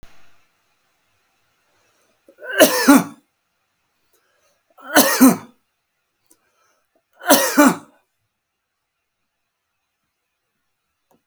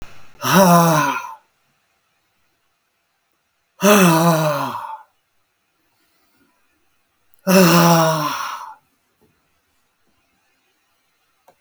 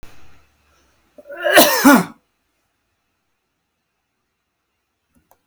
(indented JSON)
{
  "three_cough_length": "11.3 s",
  "three_cough_amplitude": 32768,
  "three_cough_signal_mean_std_ratio": 0.27,
  "exhalation_length": "11.6 s",
  "exhalation_amplitude": 32766,
  "exhalation_signal_mean_std_ratio": 0.39,
  "cough_length": "5.5 s",
  "cough_amplitude": 32768,
  "cough_signal_mean_std_ratio": 0.27,
  "survey_phase": "beta (2021-08-13 to 2022-03-07)",
  "age": "65+",
  "gender": "Male",
  "wearing_mask": "No",
  "symptom_none": true,
  "symptom_onset": "5 days",
  "smoker_status": "Ex-smoker",
  "respiratory_condition_asthma": false,
  "respiratory_condition_other": false,
  "recruitment_source": "REACT",
  "submission_delay": "2 days",
  "covid_test_result": "Positive",
  "covid_test_method": "RT-qPCR",
  "covid_ct_value": 17.3,
  "covid_ct_gene": "E gene",
  "influenza_a_test_result": "Negative",
  "influenza_b_test_result": "Negative"
}